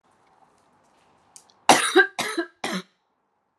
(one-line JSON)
{"three_cough_length": "3.6 s", "three_cough_amplitude": 32469, "three_cough_signal_mean_std_ratio": 0.3, "survey_phase": "beta (2021-08-13 to 2022-03-07)", "age": "18-44", "gender": "Female", "wearing_mask": "No", "symptom_runny_or_blocked_nose": true, "symptom_fatigue": true, "symptom_change_to_sense_of_smell_or_taste": true, "symptom_onset": "4 days", "smoker_status": "Never smoked", "respiratory_condition_asthma": false, "respiratory_condition_other": false, "recruitment_source": "Test and Trace", "submission_delay": "2 days", "covid_test_result": "Positive", "covid_test_method": "RT-qPCR"}